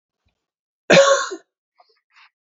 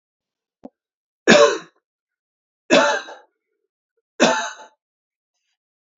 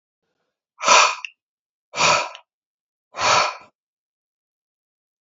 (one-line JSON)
{"cough_length": "2.5 s", "cough_amplitude": 32767, "cough_signal_mean_std_ratio": 0.31, "three_cough_length": "6.0 s", "three_cough_amplitude": 32768, "three_cough_signal_mean_std_ratio": 0.29, "exhalation_length": "5.2 s", "exhalation_amplitude": 32767, "exhalation_signal_mean_std_ratio": 0.33, "survey_phase": "beta (2021-08-13 to 2022-03-07)", "age": "45-64", "gender": "Male", "wearing_mask": "No", "symptom_cough_any": true, "symptom_runny_or_blocked_nose": true, "symptom_sore_throat": true, "symptom_diarrhoea": true, "symptom_fatigue": true, "symptom_onset": "4 days", "smoker_status": "Never smoked", "respiratory_condition_asthma": false, "respiratory_condition_other": false, "recruitment_source": "REACT", "submission_delay": "1 day", "covid_test_result": "Negative", "covid_test_method": "RT-qPCR"}